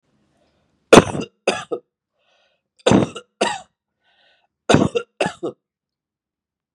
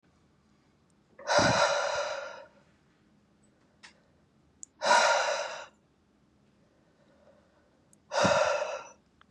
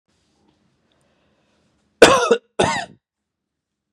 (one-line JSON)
{"three_cough_length": "6.7 s", "three_cough_amplitude": 32768, "three_cough_signal_mean_std_ratio": 0.27, "exhalation_length": "9.3 s", "exhalation_amplitude": 9819, "exhalation_signal_mean_std_ratio": 0.41, "cough_length": "3.9 s", "cough_amplitude": 32768, "cough_signal_mean_std_ratio": 0.26, "survey_phase": "beta (2021-08-13 to 2022-03-07)", "age": "18-44", "gender": "Male", "wearing_mask": "No", "symptom_runny_or_blocked_nose": true, "symptom_onset": "2 days", "smoker_status": "Never smoked", "respiratory_condition_asthma": false, "respiratory_condition_other": false, "recruitment_source": "Test and Trace", "submission_delay": "2 days", "covid_test_result": "Positive", "covid_test_method": "ePCR"}